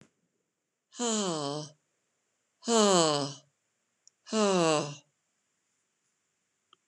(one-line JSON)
{"exhalation_length": "6.9 s", "exhalation_amplitude": 11178, "exhalation_signal_mean_std_ratio": 0.37, "survey_phase": "beta (2021-08-13 to 2022-03-07)", "age": "65+", "gender": "Female", "wearing_mask": "No", "symptom_none": true, "smoker_status": "Never smoked", "respiratory_condition_asthma": false, "respiratory_condition_other": false, "recruitment_source": "REACT", "submission_delay": "1 day", "covid_test_result": "Negative", "covid_test_method": "RT-qPCR", "influenza_a_test_result": "Negative", "influenza_b_test_result": "Negative"}